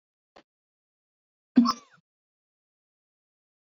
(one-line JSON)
{"cough_length": "3.7 s", "cough_amplitude": 13003, "cough_signal_mean_std_ratio": 0.16, "survey_phase": "beta (2021-08-13 to 2022-03-07)", "age": "45-64", "gender": "Male", "wearing_mask": "No", "symptom_none": true, "smoker_status": "Never smoked", "respiratory_condition_asthma": false, "respiratory_condition_other": true, "recruitment_source": "REACT", "submission_delay": "1 day", "covid_test_result": "Negative", "covid_test_method": "RT-qPCR", "influenza_a_test_result": "Negative", "influenza_b_test_result": "Negative"}